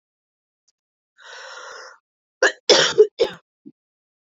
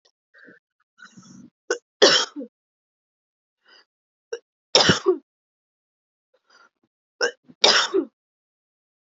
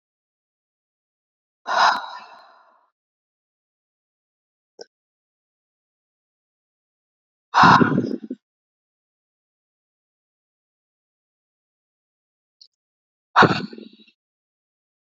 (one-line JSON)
{"cough_length": "4.3 s", "cough_amplitude": 29300, "cough_signal_mean_std_ratio": 0.28, "three_cough_length": "9.0 s", "three_cough_amplitude": 30828, "three_cough_signal_mean_std_ratio": 0.27, "exhalation_length": "15.1 s", "exhalation_amplitude": 28306, "exhalation_signal_mean_std_ratio": 0.2, "survey_phase": "beta (2021-08-13 to 2022-03-07)", "age": "18-44", "gender": "Female", "wearing_mask": "No", "symptom_none": true, "smoker_status": "Never smoked", "respiratory_condition_asthma": true, "respiratory_condition_other": false, "recruitment_source": "REACT", "submission_delay": "1 day", "covid_test_result": "Positive", "covid_test_method": "RT-qPCR", "covid_ct_value": 35.0, "covid_ct_gene": "E gene", "influenza_a_test_result": "Negative", "influenza_b_test_result": "Negative"}